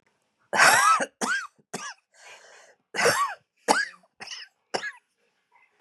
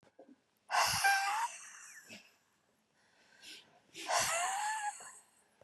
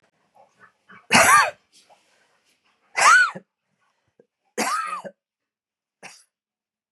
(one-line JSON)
{"cough_length": "5.8 s", "cough_amplitude": 24796, "cough_signal_mean_std_ratio": 0.4, "exhalation_length": "5.6 s", "exhalation_amplitude": 3915, "exhalation_signal_mean_std_ratio": 0.5, "three_cough_length": "6.9 s", "three_cough_amplitude": 29626, "three_cough_signal_mean_std_ratio": 0.31, "survey_phase": "beta (2021-08-13 to 2022-03-07)", "age": "45-64", "gender": "Female", "wearing_mask": "No", "symptom_cough_any": true, "symptom_runny_or_blocked_nose": true, "symptom_shortness_of_breath": true, "symptom_fatigue": true, "symptom_change_to_sense_of_smell_or_taste": true, "symptom_onset": "4 days", "smoker_status": "Never smoked", "respiratory_condition_asthma": false, "respiratory_condition_other": false, "recruitment_source": "Test and Trace", "submission_delay": "2 days", "covid_test_result": "Positive", "covid_test_method": "RT-qPCR", "covid_ct_value": 15.4, "covid_ct_gene": "ORF1ab gene", "covid_ct_mean": 15.6, "covid_viral_load": "7700000 copies/ml", "covid_viral_load_category": "High viral load (>1M copies/ml)"}